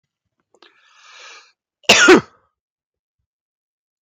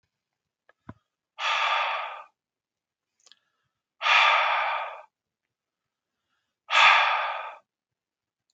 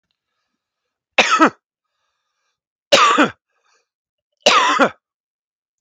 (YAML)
cough_length: 4.0 s
cough_amplitude: 32768
cough_signal_mean_std_ratio: 0.24
exhalation_length: 8.5 s
exhalation_amplitude: 17019
exhalation_signal_mean_std_ratio: 0.4
three_cough_length: 5.8 s
three_cough_amplitude: 32768
three_cough_signal_mean_std_ratio: 0.34
survey_phase: beta (2021-08-13 to 2022-03-07)
age: 45-64
gender: Male
wearing_mask: 'No'
symptom_cough_any: true
smoker_status: Current smoker (11 or more cigarettes per day)
respiratory_condition_asthma: false
respiratory_condition_other: false
recruitment_source: REACT
submission_delay: 3 days
covid_test_result: Negative
covid_test_method: RT-qPCR
influenza_a_test_result: Unknown/Void
influenza_b_test_result: Unknown/Void